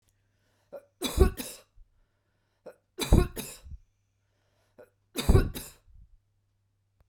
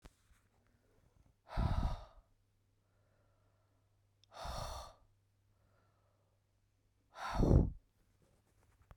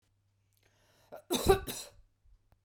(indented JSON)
{
  "three_cough_length": "7.1 s",
  "three_cough_amplitude": 17986,
  "three_cough_signal_mean_std_ratio": 0.26,
  "exhalation_length": "9.0 s",
  "exhalation_amplitude": 5719,
  "exhalation_signal_mean_std_ratio": 0.28,
  "cough_length": "2.6 s",
  "cough_amplitude": 9914,
  "cough_signal_mean_std_ratio": 0.28,
  "survey_phase": "beta (2021-08-13 to 2022-03-07)",
  "age": "45-64",
  "gender": "Female",
  "wearing_mask": "No",
  "symptom_none": true,
  "smoker_status": "Current smoker (11 or more cigarettes per day)",
  "respiratory_condition_asthma": false,
  "respiratory_condition_other": false,
  "recruitment_source": "REACT",
  "submission_delay": "2 days",
  "covid_test_result": "Negative",
  "covid_test_method": "RT-qPCR",
  "influenza_a_test_result": "Negative",
  "influenza_b_test_result": "Negative"
}